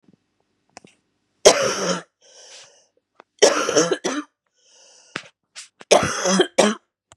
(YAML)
three_cough_length: 7.2 s
three_cough_amplitude: 32768
three_cough_signal_mean_std_ratio: 0.37
survey_phase: beta (2021-08-13 to 2022-03-07)
age: 18-44
gender: Female
wearing_mask: 'No'
symptom_cough_any: true
symptom_new_continuous_cough: true
symptom_runny_or_blocked_nose: true
symptom_shortness_of_breath: true
symptom_sore_throat: true
symptom_fatigue: true
symptom_headache: true
smoker_status: Current smoker (e-cigarettes or vapes only)
respiratory_condition_asthma: false
respiratory_condition_other: false
recruitment_source: Test and Trace
submission_delay: 2 days
covid_test_result: Positive
covid_test_method: LFT